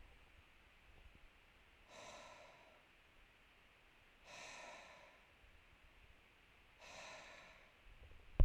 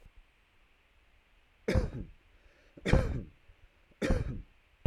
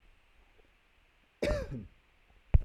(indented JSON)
{
  "exhalation_length": "8.4 s",
  "exhalation_amplitude": 4100,
  "exhalation_signal_mean_std_ratio": 0.2,
  "three_cough_length": "4.9 s",
  "three_cough_amplitude": 9998,
  "three_cough_signal_mean_std_ratio": 0.36,
  "cough_length": "2.6 s",
  "cough_amplitude": 11632,
  "cough_signal_mean_std_ratio": 0.26,
  "survey_phase": "beta (2021-08-13 to 2022-03-07)",
  "age": "18-44",
  "gender": "Male",
  "wearing_mask": "No",
  "symptom_none": true,
  "smoker_status": "Never smoked",
  "respiratory_condition_asthma": false,
  "respiratory_condition_other": false,
  "recruitment_source": "REACT",
  "submission_delay": "2 days",
  "covid_test_result": "Positive",
  "covid_test_method": "RT-qPCR",
  "covid_ct_value": 33.0,
  "covid_ct_gene": "E gene",
  "influenza_a_test_result": "Negative",
  "influenza_b_test_result": "Negative"
}